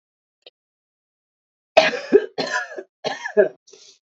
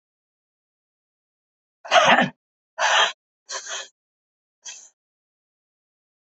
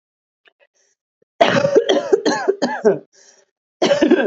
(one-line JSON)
{"three_cough_length": "4.1 s", "three_cough_amplitude": 27368, "three_cough_signal_mean_std_ratio": 0.31, "exhalation_length": "6.4 s", "exhalation_amplitude": 26528, "exhalation_signal_mean_std_ratio": 0.28, "cough_length": "4.3 s", "cough_amplitude": 28998, "cough_signal_mean_std_ratio": 0.51, "survey_phase": "alpha (2021-03-01 to 2021-08-12)", "age": "18-44", "gender": "Female", "wearing_mask": "No", "symptom_cough_any": true, "symptom_abdominal_pain": true, "symptom_diarrhoea": true, "symptom_fatigue": true, "symptom_headache": true, "symptom_change_to_sense_of_smell_or_taste": true, "symptom_onset": "3 days", "smoker_status": "Current smoker (11 or more cigarettes per day)", "respiratory_condition_asthma": false, "respiratory_condition_other": false, "recruitment_source": "Test and Trace", "submission_delay": "1 day", "covid_test_result": "Positive", "covid_test_method": "RT-qPCR", "covid_ct_value": 17.4, "covid_ct_gene": "ORF1ab gene", "covid_ct_mean": 17.9, "covid_viral_load": "1300000 copies/ml", "covid_viral_load_category": "High viral load (>1M copies/ml)"}